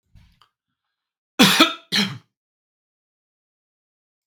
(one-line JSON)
{"cough_length": "4.3 s", "cough_amplitude": 32768, "cough_signal_mean_std_ratio": 0.25, "survey_phase": "beta (2021-08-13 to 2022-03-07)", "age": "45-64", "gender": "Male", "wearing_mask": "No", "symptom_none": true, "smoker_status": "Never smoked", "respiratory_condition_asthma": false, "respiratory_condition_other": false, "recruitment_source": "REACT", "submission_delay": "2 days", "covid_test_result": "Negative", "covid_test_method": "RT-qPCR", "influenza_a_test_result": "Negative", "influenza_b_test_result": "Negative"}